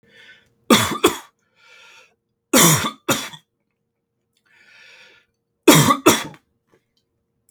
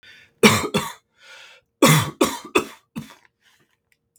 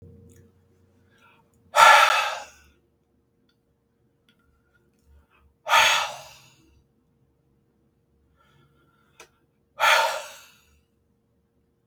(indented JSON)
{
  "three_cough_length": "7.5 s",
  "three_cough_amplitude": 32768,
  "three_cough_signal_mean_std_ratio": 0.32,
  "cough_length": "4.2 s",
  "cough_amplitude": 32768,
  "cough_signal_mean_std_ratio": 0.35,
  "exhalation_length": "11.9 s",
  "exhalation_amplitude": 32766,
  "exhalation_signal_mean_std_ratio": 0.26,
  "survey_phase": "beta (2021-08-13 to 2022-03-07)",
  "age": "18-44",
  "gender": "Male",
  "wearing_mask": "No",
  "symptom_none": true,
  "smoker_status": "Never smoked",
  "respiratory_condition_asthma": false,
  "respiratory_condition_other": false,
  "recruitment_source": "REACT",
  "submission_delay": "2 days",
  "covid_test_result": "Negative",
  "covid_test_method": "RT-qPCR",
  "influenza_a_test_result": "Negative",
  "influenza_b_test_result": "Negative"
}